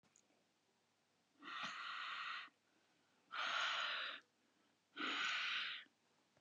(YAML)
exhalation_length: 6.4 s
exhalation_amplitude: 1142
exhalation_signal_mean_std_ratio: 0.58
survey_phase: beta (2021-08-13 to 2022-03-07)
age: 18-44
gender: Female
wearing_mask: 'No'
symptom_shortness_of_breath: true
smoker_status: Never smoked
respiratory_condition_asthma: false
respiratory_condition_other: false
recruitment_source: REACT
submission_delay: 3 days
covid_test_result: Negative
covid_test_method: RT-qPCR
influenza_a_test_result: Negative
influenza_b_test_result: Negative